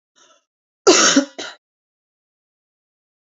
cough_length: 3.3 s
cough_amplitude: 32768
cough_signal_mean_std_ratio: 0.28
survey_phase: beta (2021-08-13 to 2022-03-07)
age: 45-64
gender: Female
wearing_mask: 'No'
symptom_cough_any: true
symptom_runny_or_blocked_nose: true
symptom_sore_throat: true
symptom_fatigue: true
symptom_headache: true
symptom_change_to_sense_of_smell_or_taste: true
symptom_onset: 3 days
smoker_status: Never smoked
respiratory_condition_asthma: false
respiratory_condition_other: false
recruitment_source: Test and Trace
submission_delay: 2 days
covid_test_result: Positive
covid_test_method: RT-qPCR
covid_ct_value: 20.5
covid_ct_gene: ORF1ab gene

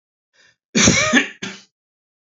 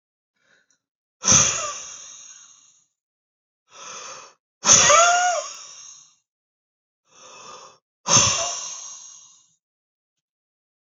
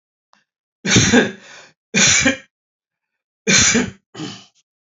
cough_length: 2.3 s
cough_amplitude: 28810
cough_signal_mean_std_ratio: 0.4
exhalation_length: 10.8 s
exhalation_amplitude: 29850
exhalation_signal_mean_std_ratio: 0.34
three_cough_length: 4.9 s
three_cough_amplitude: 30711
three_cough_signal_mean_std_ratio: 0.44
survey_phase: beta (2021-08-13 to 2022-03-07)
age: 18-44
gender: Male
wearing_mask: 'No'
symptom_cough_any: true
symptom_new_continuous_cough: true
symptom_runny_or_blocked_nose: true
symptom_shortness_of_breath: true
symptom_sore_throat: true
symptom_fatigue: true
symptom_headache: true
symptom_change_to_sense_of_smell_or_taste: true
symptom_loss_of_taste: true
symptom_onset: 12 days
smoker_status: Ex-smoker
respiratory_condition_asthma: false
respiratory_condition_other: true
recruitment_source: Test and Trace
submission_delay: 2 days
covid_test_result: Positive
covid_test_method: RT-qPCR
covid_ct_value: 27.3
covid_ct_gene: N gene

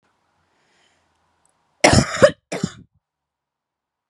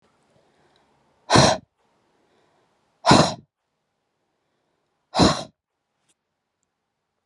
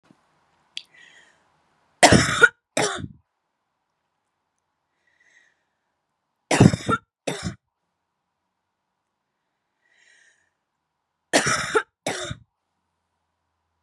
cough_length: 4.1 s
cough_amplitude: 32767
cough_signal_mean_std_ratio: 0.24
exhalation_length: 7.3 s
exhalation_amplitude: 31567
exhalation_signal_mean_std_ratio: 0.25
three_cough_length: 13.8 s
three_cough_amplitude: 32752
three_cough_signal_mean_std_ratio: 0.23
survey_phase: beta (2021-08-13 to 2022-03-07)
age: 18-44
gender: Female
wearing_mask: 'No'
symptom_runny_or_blocked_nose: true
symptom_fatigue: true
symptom_fever_high_temperature: true
symptom_headache: true
symptom_change_to_sense_of_smell_or_taste: true
symptom_loss_of_taste: true
symptom_onset: 2 days
smoker_status: Never smoked
respiratory_condition_asthma: false
respiratory_condition_other: false
recruitment_source: Test and Trace
submission_delay: 1 day
covid_test_result: Positive
covid_test_method: RT-qPCR
covid_ct_value: 23.4
covid_ct_gene: ORF1ab gene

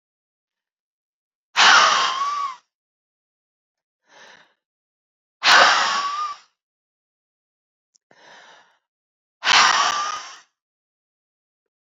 exhalation_length: 11.9 s
exhalation_amplitude: 29928
exhalation_signal_mean_std_ratio: 0.35
survey_phase: beta (2021-08-13 to 2022-03-07)
age: 18-44
gender: Female
wearing_mask: 'No'
symptom_none: true
smoker_status: Never smoked
respiratory_condition_asthma: false
respiratory_condition_other: false
recruitment_source: Test and Trace
submission_delay: 77 days
covid_test_result: Negative
covid_test_method: RT-qPCR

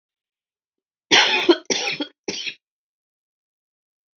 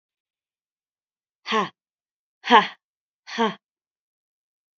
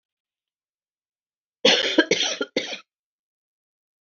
three_cough_length: 4.2 s
three_cough_amplitude: 28289
three_cough_signal_mean_std_ratio: 0.32
exhalation_length: 4.8 s
exhalation_amplitude: 28119
exhalation_signal_mean_std_ratio: 0.22
cough_length: 4.0 s
cough_amplitude: 25289
cough_signal_mean_std_ratio: 0.32
survey_phase: beta (2021-08-13 to 2022-03-07)
age: 45-64
gender: Female
wearing_mask: 'No'
symptom_cough_any: true
symptom_runny_or_blocked_nose: true
symptom_sore_throat: true
symptom_fever_high_temperature: true
smoker_status: Never smoked
respiratory_condition_asthma: true
respiratory_condition_other: false
recruitment_source: REACT
submission_delay: 1 day
covid_test_result: Negative
covid_test_method: RT-qPCR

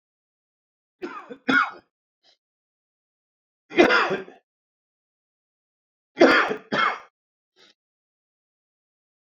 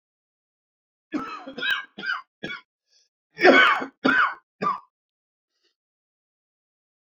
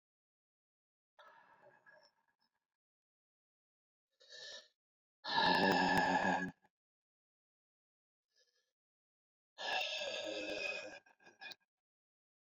three_cough_length: 9.4 s
three_cough_amplitude: 26448
three_cough_signal_mean_std_ratio: 0.28
cough_length: 7.2 s
cough_amplitude: 25491
cough_signal_mean_std_ratio: 0.33
exhalation_length: 12.5 s
exhalation_amplitude: 3601
exhalation_signal_mean_std_ratio: 0.35
survey_phase: beta (2021-08-13 to 2022-03-07)
age: 65+
gender: Male
wearing_mask: 'No'
symptom_runny_or_blocked_nose: true
symptom_fatigue: true
symptom_other: true
smoker_status: Ex-smoker
respiratory_condition_asthma: true
respiratory_condition_other: false
recruitment_source: Test and Trace
submission_delay: 2 days
covid_test_result: Positive
covid_test_method: RT-qPCR
covid_ct_value: 17.9
covid_ct_gene: ORF1ab gene
covid_ct_mean: 18.2
covid_viral_load: 1100000 copies/ml
covid_viral_load_category: High viral load (>1M copies/ml)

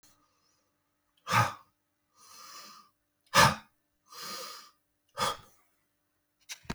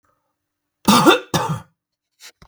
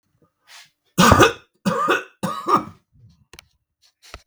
exhalation_length: 6.7 s
exhalation_amplitude: 13121
exhalation_signal_mean_std_ratio: 0.26
cough_length: 2.5 s
cough_amplitude: 32768
cough_signal_mean_std_ratio: 0.36
three_cough_length: 4.3 s
three_cough_amplitude: 32768
three_cough_signal_mean_std_ratio: 0.37
survey_phase: beta (2021-08-13 to 2022-03-07)
age: 45-64
gender: Male
wearing_mask: 'No'
symptom_none: true
smoker_status: Ex-smoker
respiratory_condition_asthma: false
respiratory_condition_other: false
recruitment_source: REACT
submission_delay: 1 day
covid_test_result: Negative
covid_test_method: RT-qPCR
influenza_a_test_result: Negative
influenza_b_test_result: Negative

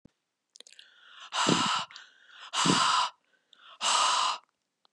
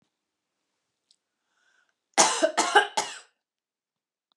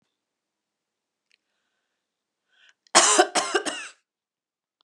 exhalation_length: 4.9 s
exhalation_amplitude: 11128
exhalation_signal_mean_std_ratio: 0.51
three_cough_length: 4.4 s
three_cough_amplitude: 24539
three_cough_signal_mean_std_ratio: 0.28
cough_length: 4.8 s
cough_amplitude: 29273
cough_signal_mean_std_ratio: 0.26
survey_phase: beta (2021-08-13 to 2022-03-07)
age: 18-44
gender: Female
wearing_mask: 'No'
symptom_cough_any: true
symptom_runny_or_blocked_nose: true
symptom_sore_throat: true
symptom_onset: 5 days
smoker_status: Ex-smoker
respiratory_condition_asthma: false
respiratory_condition_other: false
recruitment_source: REACT
submission_delay: 1 day
covid_test_result: Positive
covid_test_method: RT-qPCR
covid_ct_value: 30.0
covid_ct_gene: E gene
influenza_a_test_result: Negative
influenza_b_test_result: Negative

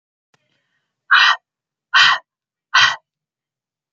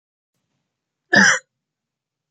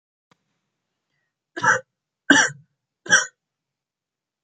exhalation_length: 3.9 s
exhalation_amplitude: 30904
exhalation_signal_mean_std_ratio: 0.34
cough_length: 2.3 s
cough_amplitude: 30514
cough_signal_mean_std_ratio: 0.26
three_cough_length: 4.4 s
three_cough_amplitude: 28489
three_cough_signal_mean_std_ratio: 0.26
survey_phase: beta (2021-08-13 to 2022-03-07)
age: 18-44
gender: Male
wearing_mask: 'No'
symptom_none: true
smoker_status: Never smoked
respiratory_condition_asthma: false
respiratory_condition_other: false
recruitment_source: REACT
submission_delay: 2 days
covid_test_result: Negative
covid_test_method: RT-qPCR
influenza_a_test_result: Negative
influenza_b_test_result: Negative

